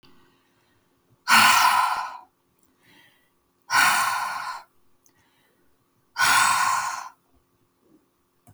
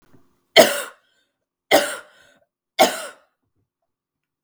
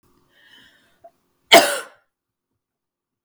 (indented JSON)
{
  "exhalation_length": "8.5 s",
  "exhalation_amplitude": 22399,
  "exhalation_signal_mean_std_ratio": 0.43,
  "three_cough_length": "4.4 s",
  "three_cough_amplitude": 32768,
  "three_cough_signal_mean_std_ratio": 0.26,
  "cough_length": "3.2 s",
  "cough_amplitude": 32768,
  "cough_signal_mean_std_ratio": 0.2,
  "survey_phase": "beta (2021-08-13 to 2022-03-07)",
  "age": "45-64",
  "gender": "Female",
  "wearing_mask": "No",
  "symptom_none": true,
  "smoker_status": "Never smoked",
  "respiratory_condition_asthma": false,
  "respiratory_condition_other": false,
  "recruitment_source": "REACT",
  "submission_delay": "2 days",
  "covid_test_result": "Negative",
  "covid_test_method": "RT-qPCR",
  "influenza_a_test_result": "Negative",
  "influenza_b_test_result": "Negative"
}